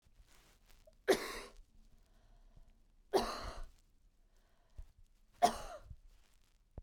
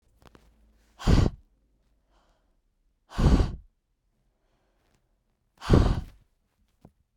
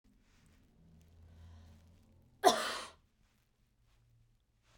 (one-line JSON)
{"three_cough_length": "6.8 s", "three_cough_amplitude": 5346, "three_cough_signal_mean_std_ratio": 0.3, "exhalation_length": "7.2 s", "exhalation_amplitude": 20772, "exhalation_signal_mean_std_ratio": 0.28, "cough_length": "4.8 s", "cough_amplitude": 8515, "cough_signal_mean_std_ratio": 0.21, "survey_phase": "beta (2021-08-13 to 2022-03-07)", "age": "18-44", "gender": "Female", "wearing_mask": "No", "symptom_runny_or_blocked_nose": true, "symptom_shortness_of_breath": true, "symptom_sore_throat": true, "symptom_abdominal_pain": true, "symptom_fatigue": true, "symptom_headache": true, "symptom_change_to_sense_of_smell_or_taste": true, "symptom_loss_of_taste": true, "symptom_onset": "3 days", "smoker_status": "Never smoked", "respiratory_condition_asthma": false, "respiratory_condition_other": false, "recruitment_source": "Test and Trace", "submission_delay": "2 days", "covid_test_result": "Positive", "covid_test_method": "LAMP"}